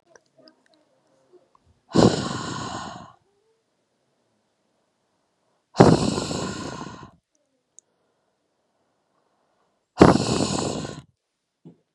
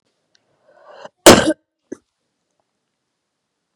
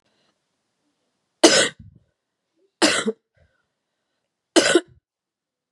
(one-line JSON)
{"exhalation_length": "11.9 s", "exhalation_amplitude": 32768, "exhalation_signal_mean_std_ratio": 0.28, "cough_length": "3.8 s", "cough_amplitude": 32768, "cough_signal_mean_std_ratio": 0.19, "three_cough_length": "5.7 s", "three_cough_amplitude": 32767, "three_cough_signal_mean_std_ratio": 0.27, "survey_phase": "beta (2021-08-13 to 2022-03-07)", "age": "18-44", "gender": "Female", "wearing_mask": "No", "symptom_cough_any": true, "symptom_new_continuous_cough": true, "symptom_runny_or_blocked_nose": true, "symptom_fatigue": true, "symptom_fever_high_temperature": true, "symptom_headache": true, "symptom_other": true, "symptom_onset": "3 days", "smoker_status": "Ex-smoker", "respiratory_condition_asthma": false, "respiratory_condition_other": false, "recruitment_source": "Test and Trace", "submission_delay": "1 day", "covid_test_result": "Positive", "covid_test_method": "RT-qPCR", "covid_ct_value": 20.5, "covid_ct_gene": "N gene"}